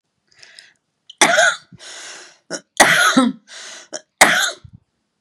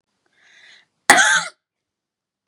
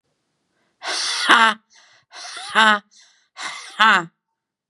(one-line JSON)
{"three_cough_length": "5.2 s", "three_cough_amplitude": 32768, "three_cough_signal_mean_std_ratio": 0.41, "cough_length": "2.5 s", "cough_amplitude": 32768, "cough_signal_mean_std_ratio": 0.29, "exhalation_length": "4.7 s", "exhalation_amplitude": 32768, "exhalation_signal_mean_std_ratio": 0.36, "survey_phase": "beta (2021-08-13 to 2022-03-07)", "age": "45-64", "gender": "Female", "wearing_mask": "No", "symptom_none": true, "smoker_status": "Ex-smoker", "respiratory_condition_asthma": false, "respiratory_condition_other": false, "recruitment_source": "REACT", "submission_delay": "1 day", "covid_test_result": "Negative", "covid_test_method": "RT-qPCR", "influenza_a_test_result": "Negative", "influenza_b_test_result": "Negative"}